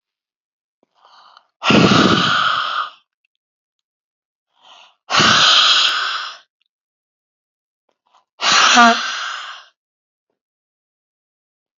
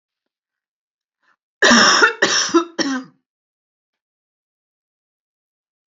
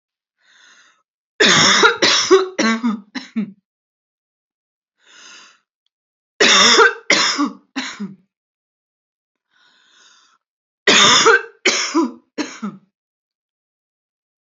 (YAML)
exhalation_length: 11.8 s
exhalation_amplitude: 32768
exhalation_signal_mean_std_ratio: 0.42
cough_length: 6.0 s
cough_amplitude: 29734
cough_signal_mean_std_ratio: 0.33
three_cough_length: 14.4 s
three_cough_amplitude: 32731
three_cough_signal_mean_std_ratio: 0.4
survey_phase: beta (2021-08-13 to 2022-03-07)
age: 45-64
gender: Female
wearing_mask: 'No'
symptom_none: true
smoker_status: Ex-smoker
respiratory_condition_asthma: false
respiratory_condition_other: false
recruitment_source: REACT
submission_delay: 0 days
covid_test_result: Negative
covid_test_method: RT-qPCR
influenza_a_test_result: Negative
influenza_b_test_result: Negative